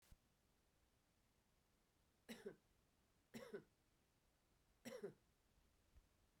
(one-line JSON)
{"three_cough_length": "6.4 s", "three_cough_amplitude": 254, "three_cough_signal_mean_std_ratio": 0.37, "survey_phase": "beta (2021-08-13 to 2022-03-07)", "age": "45-64", "gender": "Female", "wearing_mask": "No", "symptom_cough_any": true, "symptom_runny_or_blocked_nose": true, "symptom_shortness_of_breath": true, "symptom_fatigue": true, "symptom_fever_high_temperature": true, "symptom_headache": true, "symptom_change_to_sense_of_smell_or_taste": true, "symptom_onset": "3 days", "smoker_status": "Ex-smoker", "respiratory_condition_asthma": true, "respiratory_condition_other": false, "recruitment_source": "Test and Trace", "submission_delay": "1 day", "covid_test_result": "Positive", "covid_test_method": "ePCR"}